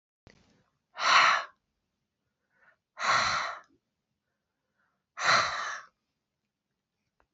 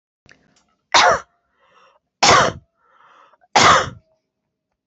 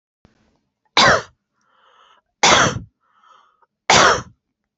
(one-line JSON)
{"exhalation_length": "7.3 s", "exhalation_amplitude": 11419, "exhalation_signal_mean_std_ratio": 0.34, "cough_length": "4.9 s", "cough_amplitude": 30456, "cough_signal_mean_std_ratio": 0.34, "three_cough_length": "4.8 s", "three_cough_amplitude": 32768, "three_cough_signal_mean_std_ratio": 0.35, "survey_phase": "beta (2021-08-13 to 2022-03-07)", "age": "45-64", "gender": "Female", "wearing_mask": "No", "symptom_none": true, "smoker_status": "Never smoked", "respiratory_condition_asthma": false, "respiratory_condition_other": false, "recruitment_source": "REACT", "submission_delay": "3 days", "covid_test_result": "Negative", "covid_test_method": "RT-qPCR"}